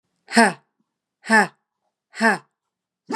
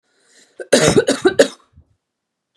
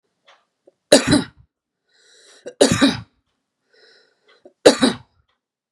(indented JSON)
{
  "exhalation_length": "3.2 s",
  "exhalation_amplitude": 31953,
  "exhalation_signal_mean_std_ratio": 0.31,
  "cough_length": "2.6 s",
  "cough_amplitude": 32768,
  "cough_signal_mean_std_ratio": 0.37,
  "three_cough_length": "5.7 s",
  "three_cough_amplitude": 32768,
  "three_cough_signal_mean_std_ratio": 0.28,
  "survey_phase": "beta (2021-08-13 to 2022-03-07)",
  "age": "18-44",
  "gender": "Female",
  "wearing_mask": "No",
  "symptom_none": true,
  "smoker_status": "Current smoker (e-cigarettes or vapes only)",
  "respiratory_condition_asthma": false,
  "respiratory_condition_other": false,
  "recruitment_source": "REACT",
  "submission_delay": "3 days",
  "covid_test_result": "Negative",
  "covid_test_method": "RT-qPCR",
  "influenza_a_test_result": "Negative",
  "influenza_b_test_result": "Negative"
}